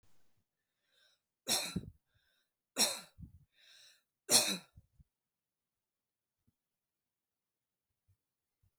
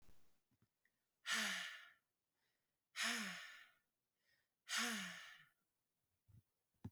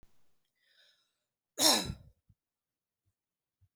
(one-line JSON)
{"three_cough_length": "8.8 s", "three_cough_amplitude": 8405, "three_cough_signal_mean_std_ratio": 0.22, "exhalation_length": "6.9 s", "exhalation_amplitude": 1217, "exhalation_signal_mean_std_ratio": 0.41, "cough_length": "3.8 s", "cough_amplitude": 9565, "cough_signal_mean_std_ratio": 0.22, "survey_phase": "beta (2021-08-13 to 2022-03-07)", "age": "18-44", "gender": "Female", "wearing_mask": "No", "symptom_none": true, "smoker_status": "Never smoked", "respiratory_condition_asthma": true, "respiratory_condition_other": false, "recruitment_source": "REACT", "submission_delay": "2 days", "covid_test_result": "Negative", "covid_test_method": "RT-qPCR", "influenza_a_test_result": "Negative", "influenza_b_test_result": "Negative"}